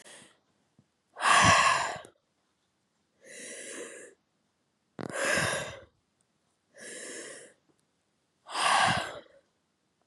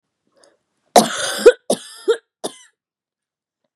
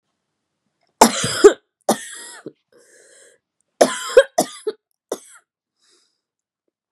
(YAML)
exhalation_length: 10.1 s
exhalation_amplitude: 12187
exhalation_signal_mean_std_ratio: 0.37
cough_length: 3.8 s
cough_amplitude: 32768
cough_signal_mean_std_ratio: 0.26
three_cough_length: 6.9 s
three_cough_amplitude: 32768
three_cough_signal_mean_std_ratio: 0.24
survey_phase: beta (2021-08-13 to 2022-03-07)
age: 18-44
gender: Female
wearing_mask: 'Yes'
symptom_cough_any: true
symptom_shortness_of_breath: true
symptom_sore_throat: true
symptom_fatigue: true
symptom_headache: true
smoker_status: Never smoked
respiratory_condition_asthma: true
respiratory_condition_other: false
recruitment_source: Test and Trace
submission_delay: 2 days
covid_test_result: Positive
covid_test_method: LFT